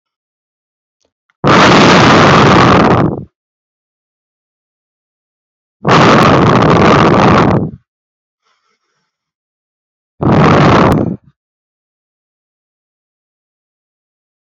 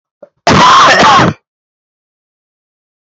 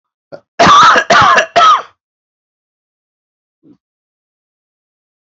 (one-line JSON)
{"exhalation_length": "14.4 s", "exhalation_amplitude": 32768, "exhalation_signal_mean_std_ratio": 0.53, "cough_length": "3.2 s", "cough_amplitude": 32768, "cough_signal_mean_std_ratio": 0.53, "three_cough_length": "5.4 s", "three_cough_amplitude": 32767, "three_cough_signal_mean_std_ratio": 0.41, "survey_phase": "beta (2021-08-13 to 2022-03-07)", "age": "18-44", "gender": "Male", "wearing_mask": "No", "symptom_none": true, "smoker_status": "Current smoker (1 to 10 cigarettes per day)", "respiratory_condition_asthma": false, "respiratory_condition_other": false, "recruitment_source": "REACT", "submission_delay": "8 days", "covid_test_result": "Negative", "covid_test_method": "RT-qPCR"}